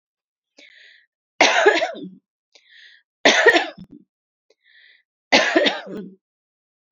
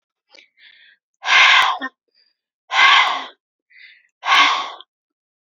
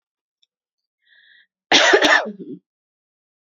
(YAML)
three_cough_length: 6.9 s
three_cough_amplitude: 32768
three_cough_signal_mean_std_ratio: 0.35
exhalation_length: 5.5 s
exhalation_amplitude: 32767
exhalation_signal_mean_std_ratio: 0.42
cough_length: 3.6 s
cough_amplitude: 31790
cough_signal_mean_std_ratio: 0.32
survey_phase: beta (2021-08-13 to 2022-03-07)
age: 18-44
gender: Female
wearing_mask: 'No'
symptom_sore_throat: true
symptom_fatigue: true
symptom_headache: true
symptom_change_to_sense_of_smell_or_taste: true
symptom_onset: 3 days
smoker_status: Never smoked
respiratory_condition_asthma: false
respiratory_condition_other: false
recruitment_source: Test and Trace
submission_delay: 1 day
covid_test_result: Positive
covid_test_method: RT-qPCR
covid_ct_value: 23.4
covid_ct_gene: ORF1ab gene